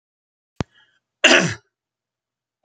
{
  "cough_length": "2.6 s",
  "cough_amplitude": 30533,
  "cough_signal_mean_std_ratio": 0.25,
  "survey_phase": "beta (2021-08-13 to 2022-03-07)",
  "age": "65+",
  "gender": "Male",
  "wearing_mask": "No",
  "symptom_none": true,
  "smoker_status": "Never smoked",
  "respiratory_condition_asthma": false,
  "respiratory_condition_other": false,
  "recruitment_source": "REACT",
  "submission_delay": "1 day",
  "covid_test_result": "Negative",
  "covid_test_method": "RT-qPCR"
}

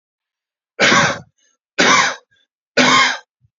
{
  "three_cough_length": "3.6 s",
  "three_cough_amplitude": 32168,
  "three_cough_signal_mean_std_ratio": 0.47,
  "survey_phase": "beta (2021-08-13 to 2022-03-07)",
  "age": "18-44",
  "gender": "Male",
  "wearing_mask": "No",
  "symptom_none": true,
  "symptom_onset": "12 days",
  "smoker_status": "Ex-smoker",
  "respiratory_condition_asthma": false,
  "respiratory_condition_other": false,
  "recruitment_source": "REACT",
  "submission_delay": "1 day",
  "covid_test_result": "Negative",
  "covid_test_method": "RT-qPCR",
  "influenza_a_test_result": "Negative",
  "influenza_b_test_result": "Negative"
}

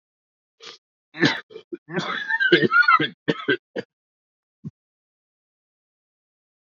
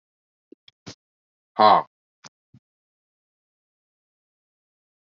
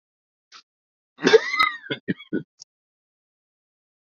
{
  "three_cough_length": "6.7 s",
  "three_cough_amplitude": 26734,
  "three_cough_signal_mean_std_ratio": 0.35,
  "exhalation_length": "5.0 s",
  "exhalation_amplitude": 25564,
  "exhalation_signal_mean_std_ratio": 0.16,
  "cough_length": "4.2 s",
  "cough_amplitude": 26550,
  "cough_signal_mean_std_ratio": 0.25,
  "survey_phase": "beta (2021-08-13 to 2022-03-07)",
  "age": "45-64",
  "gender": "Male",
  "wearing_mask": "No",
  "symptom_cough_any": true,
  "symptom_shortness_of_breath": true,
  "symptom_sore_throat": true,
  "symptom_abdominal_pain": true,
  "symptom_fatigue": true,
  "symptom_fever_high_temperature": true,
  "symptom_headache": true,
  "symptom_onset": "3 days",
  "smoker_status": "Never smoked",
  "respiratory_condition_asthma": false,
  "respiratory_condition_other": false,
  "recruitment_source": "Test and Trace",
  "submission_delay": "1 day",
  "covid_test_result": "Positive",
  "covid_test_method": "RT-qPCR",
  "covid_ct_value": 18.9,
  "covid_ct_gene": "ORF1ab gene"
}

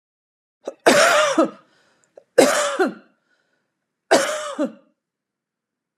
{
  "three_cough_length": "6.0 s",
  "three_cough_amplitude": 32732,
  "three_cough_signal_mean_std_ratio": 0.4,
  "survey_phase": "alpha (2021-03-01 to 2021-08-12)",
  "age": "45-64",
  "gender": "Female",
  "wearing_mask": "No",
  "symptom_none": true,
  "smoker_status": "Never smoked",
  "respiratory_condition_asthma": false,
  "respiratory_condition_other": false,
  "recruitment_source": "REACT",
  "submission_delay": "1 day",
  "covid_test_result": "Negative",
  "covid_test_method": "RT-qPCR"
}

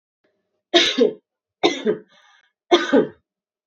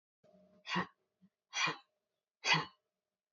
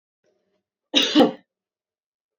{
  "three_cough_length": "3.7 s",
  "three_cough_amplitude": 28408,
  "three_cough_signal_mean_std_ratio": 0.39,
  "exhalation_length": "3.3 s",
  "exhalation_amplitude": 4607,
  "exhalation_signal_mean_std_ratio": 0.32,
  "cough_length": "2.4 s",
  "cough_amplitude": 25918,
  "cough_signal_mean_std_ratio": 0.29,
  "survey_phase": "beta (2021-08-13 to 2022-03-07)",
  "age": "18-44",
  "gender": "Female",
  "wearing_mask": "No",
  "symptom_none": true,
  "smoker_status": "Never smoked",
  "respiratory_condition_asthma": false,
  "respiratory_condition_other": false,
  "recruitment_source": "REACT",
  "submission_delay": "3 days",
  "covid_test_result": "Negative",
  "covid_test_method": "RT-qPCR",
  "influenza_a_test_result": "Negative",
  "influenza_b_test_result": "Negative"
}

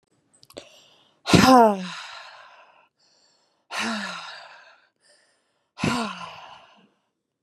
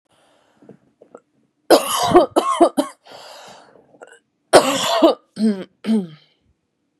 {
  "exhalation_length": "7.4 s",
  "exhalation_amplitude": 27137,
  "exhalation_signal_mean_std_ratio": 0.29,
  "cough_length": "7.0 s",
  "cough_amplitude": 32768,
  "cough_signal_mean_std_ratio": 0.39,
  "survey_phase": "beta (2021-08-13 to 2022-03-07)",
  "age": "18-44",
  "gender": "Female",
  "wearing_mask": "No",
  "symptom_cough_any": true,
  "symptom_runny_or_blocked_nose": true,
  "symptom_shortness_of_breath": true,
  "symptom_onset": "10 days",
  "smoker_status": "Ex-smoker",
  "respiratory_condition_asthma": false,
  "respiratory_condition_other": false,
  "recruitment_source": "REACT",
  "submission_delay": "1 day",
  "covid_test_result": "Negative",
  "covid_test_method": "RT-qPCR",
  "covid_ct_value": 38.0,
  "covid_ct_gene": "N gene",
  "influenza_a_test_result": "Unknown/Void",
  "influenza_b_test_result": "Unknown/Void"
}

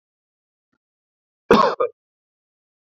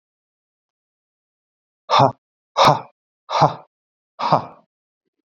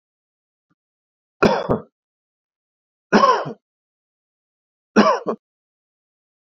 {
  "cough_length": "2.9 s",
  "cough_amplitude": 28918,
  "cough_signal_mean_std_ratio": 0.24,
  "exhalation_length": "5.4 s",
  "exhalation_amplitude": 31317,
  "exhalation_signal_mean_std_ratio": 0.29,
  "three_cough_length": "6.6 s",
  "three_cough_amplitude": 28424,
  "three_cough_signal_mean_std_ratio": 0.28,
  "survey_phase": "beta (2021-08-13 to 2022-03-07)",
  "age": "45-64",
  "gender": "Male",
  "wearing_mask": "No",
  "symptom_none": true,
  "smoker_status": "Never smoked",
  "respiratory_condition_asthma": false,
  "respiratory_condition_other": false,
  "recruitment_source": "REACT",
  "submission_delay": "1 day",
  "covid_test_result": "Negative",
  "covid_test_method": "RT-qPCR",
  "influenza_a_test_result": "Negative",
  "influenza_b_test_result": "Negative"
}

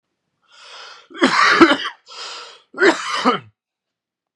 {
  "cough_length": "4.4 s",
  "cough_amplitude": 32768,
  "cough_signal_mean_std_ratio": 0.41,
  "survey_phase": "beta (2021-08-13 to 2022-03-07)",
  "age": "18-44",
  "gender": "Male",
  "wearing_mask": "No",
  "symptom_cough_any": true,
  "symptom_shortness_of_breath": true,
  "symptom_sore_throat": true,
  "symptom_fatigue": true,
  "symptom_fever_high_temperature": true,
  "symptom_onset": "3 days",
  "smoker_status": "Ex-smoker",
  "respiratory_condition_asthma": false,
  "respiratory_condition_other": false,
  "recruitment_source": "Test and Trace",
  "submission_delay": "1 day",
  "covid_test_result": "Positive",
  "covid_test_method": "RT-qPCR",
  "covid_ct_value": 22.9,
  "covid_ct_gene": "ORF1ab gene",
  "covid_ct_mean": 23.3,
  "covid_viral_load": "22000 copies/ml",
  "covid_viral_load_category": "Low viral load (10K-1M copies/ml)"
}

